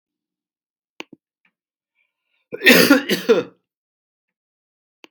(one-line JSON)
{"cough_length": "5.1 s", "cough_amplitude": 32767, "cough_signal_mean_std_ratio": 0.27, "survey_phase": "beta (2021-08-13 to 2022-03-07)", "age": "65+", "gender": "Male", "wearing_mask": "No", "symptom_cough_any": true, "smoker_status": "Ex-smoker", "respiratory_condition_asthma": false, "respiratory_condition_other": false, "recruitment_source": "REACT", "submission_delay": "1 day", "covid_test_result": "Negative", "covid_test_method": "RT-qPCR", "influenza_a_test_result": "Negative", "influenza_b_test_result": "Negative"}